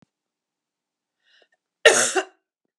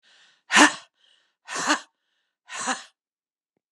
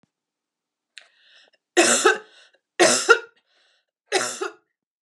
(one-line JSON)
{"cough_length": "2.8 s", "cough_amplitude": 32768, "cough_signal_mean_std_ratio": 0.24, "exhalation_length": "3.7 s", "exhalation_amplitude": 28271, "exhalation_signal_mean_std_ratio": 0.28, "three_cough_length": "5.0 s", "three_cough_amplitude": 31432, "three_cough_signal_mean_std_ratio": 0.33, "survey_phase": "beta (2021-08-13 to 2022-03-07)", "age": "45-64", "gender": "Female", "wearing_mask": "No", "symptom_cough_any": true, "symptom_onset": "3 days", "smoker_status": "Never smoked", "respiratory_condition_asthma": false, "respiratory_condition_other": false, "recruitment_source": "Test and Trace", "submission_delay": "2 days", "covid_test_result": "Positive", "covid_test_method": "RT-qPCR", "covid_ct_value": 25.0, "covid_ct_gene": "N gene"}